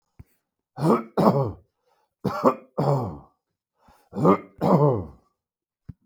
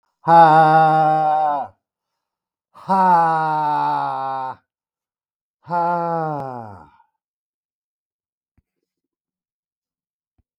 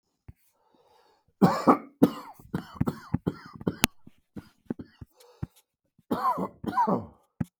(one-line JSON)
{"three_cough_length": "6.1 s", "three_cough_amplitude": 25622, "three_cough_signal_mean_std_ratio": 0.43, "exhalation_length": "10.6 s", "exhalation_amplitude": 32563, "exhalation_signal_mean_std_ratio": 0.5, "cough_length": "7.6 s", "cough_amplitude": 32768, "cough_signal_mean_std_ratio": 0.33, "survey_phase": "beta (2021-08-13 to 2022-03-07)", "age": "45-64", "gender": "Male", "wearing_mask": "No", "symptom_cough_any": true, "symptom_new_continuous_cough": true, "symptom_runny_or_blocked_nose": true, "symptom_sore_throat": true, "symptom_fatigue": true, "symptom_fever_high_temperature": true, "symptom_headache": true, "symptom_change_to_sense_of_smell_or_taste": true, "symptom_loss_of_taste": true, "symptom_other": true, "symptom_onset": "5 days", "smoker_status": "Ex-smoker", "respiratory_condition_asthma": false, "respiratory_condition_other": false, "recruitment_source": "Test and Trace", "submission_delay": "1 day", "covid_test_result": "Positive", "covid_test_method": "RT-qPCR", "covid_ct_value": 27.2, "covid_ct_gene": "ORF1ab gene"}